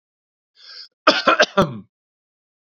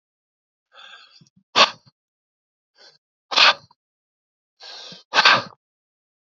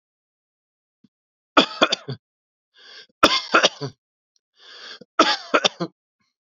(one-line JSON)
{"cough_length": "2.7 s", "cough_amplitude": 29227, "cough_signal_mean_std_ratio": 0.31, "exhalation_length": "6.3 s", "exhalation_amplitude": 32767, "exhalation_signal_mean_std_ratio": 0.24, "three_cough_length": "6.5 s", "three_cough_amplitude": 32767, "three_cough_signal_mean_std_ratio": 0.29, "survey_phase": "beta (2021-08-13 to 2022-03-07)", "age": "45-64", "gender": "Male", "wearing_mask": "No", "symptom_none": true, "smoker_status": "Never smoked", "respiratory_condition_asthma": false, "respiratory_condition_other": false, "recruitment_source": "REACT", "submission_delay": "1 day", "covid_test_result": "Negative", "covid_test_method": "RT-qPCR", "influenza_a_test_result": "Negative", "influenza_b_test_result": "Negative"}